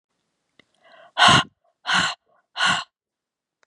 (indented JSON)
{
  "exhalation_length": "3.7 s",
  "exhalation_amplitude": 29776,
  "exhalation_signal_mean_std_ratio": 0.34,
  "survey_phase": "beta (2021-08-13 to 2022-03-07)",
  "age": "45-64",
  "gender": "Female",
  "wearing_mask": "No",
  "symptom_runny_or_blocked_nose": true,
  "symptom_fatigue": true,
  "symptom_headache": true,
  "smoker_status": "Never smoked",
  "respiratory_condition_asthma": false,
  "respiratory_condition_other": true,
  "recruitment_source": "REACT",
  "submission_delay": "1 day",
  "covid_test_result": "Negative",
  "covid_test_method": "RT-qPCR",
  "influenza_a_test_result": "Negative",
  "influenza_b_test_result": "Negative"
}